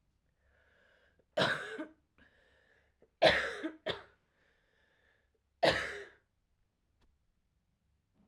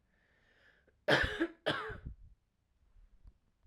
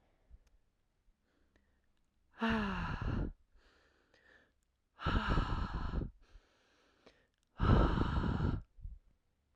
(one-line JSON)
{"three_cough_length": "8.3 s", "three_cough_amplitude": 9041, "three_cough_signal_mean_std_ratio": 0.27, "cough_length": "3.7 s", "cough_amplitude": 6677, "cough_signal_mean_std_ratio": 0.34, "exhalation_length": "9.6 s", "exhalation_amplitude": 5234, "exhalation_signal_mean_std_ratio": 0.45, "survey_phase": "alpha (2021-03-01 to 2021-08-12)", "age": "18-44", "gender": "Female", "wearing_mask": "No", "symptom_cough_any": true, "symptom_fatigue": true, "symptom_headache": true, "symptom_onset": "4 days", "smoker_status": "Never smoked", "respiratory_condition_asthma": false, "respiratory_condition_other": false, "recruitment_source": "Test and Trace", "submission_delay": "1 day", "covid_test_result": "Positive", "covid_test_method": "RT-qPCR"}